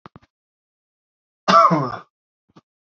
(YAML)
cough_length: 3.0 s
cough_amplitude: 26724
cough_signal_mean_std_ratio: 0.29
survey_phase: beta (2021-08-13 to 2022-03-07)
age: 18-44
gender: Male
wearing_mask: 'No'
symptom_none: true
smoker_status: Never smoked
respiratory_condition_asthma: false
respiratory_condition_other: false
recruitment_source: REACT
submission_delay: 1 day
covid_test_result: Negative
covid_test_method: RT-qPCR
influenza_a_test_result: Negative
influenza_b_test_result: Negative